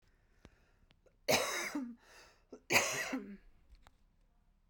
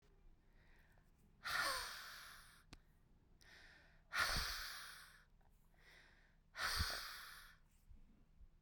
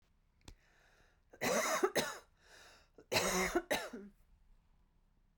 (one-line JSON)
{"three_cough_length": "4.7 s", "three_cough_amplitude": 6310, "three_cough_signal_mean_std_ratio": 0.39, "exhalation_length": "8.6 s", "exhalation_amplitude": 1908, "exhalation_signal_mean_std_ratio": 0.48, "cough_length": "5.4 s", "cough_amplitude": 3893, "cough_signal_mean_std_ratio": 0.44, "survey_phase": "beta (2021-08-13 to 2022-03-07)", "age": "18-44", "gender": "Female", "wearing_mask": "No", "symptom_cough_any": true, "symptom_runny_or_blocked_nose": true, "symptom_shortness_of_breath": true, "symptom_sore_throat": true, "symptom_abdominal_pain": true, "symptom_fatigue": true, "symptom_headache": true, "symptom_change_to_sense_of_smell_or_taste": true, "symptom_loss_of_taste": true, "symptom_onset": "9 days", "smoker_status": "Ex-smoker", "respiratory_condition_asthma": false, "respiratory_condition_other": false, "recruitment_source": "Test and Trace", "submission_delay": "2 days", "covid_test_result": "Positive", "covid_test_method": "RT-qPCR", "covid_ct_value": 20.4, "covid_ct_gene": "ORF1ab gene"}